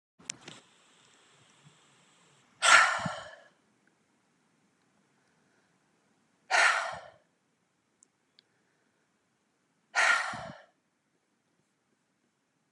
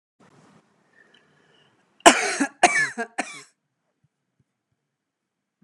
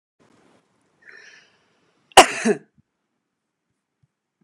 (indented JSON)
{
  "exhalation_length": "12.7 s",
  "exhalation_amplitude": 17804,
  "exhalation_signal_mean_std_ratio": 0.25,
  "three_cough_length": "5.6 s",
  "three_cough_amplitude": 32768,
  "three_cough_signal_mean_std_ratio": 0.24,
  "cough_length": "4.4 s",
  "cough_amplitude": 32768,
  "cough_signal_mean_std_ratio": 0.16,
  "survey_phase": "beta (2021-08-13 to 2022-03-07)",
  "age": "45-64",
  "gender": "Female",
  "wearing_mask": "No",
  "symptom_none": true,
  "symptom_onset": "6 days",
  "smoker_status": "Ex-smoker",
  "respiratory_condition_asthma": false,
  "respiratory_condition_other": false,
  "recruitment_source": "REACT",
  "submission_delay": "1 day",
  "covid_test_result": "Negative",
  "covid_test_method": "RT-qPCR"
}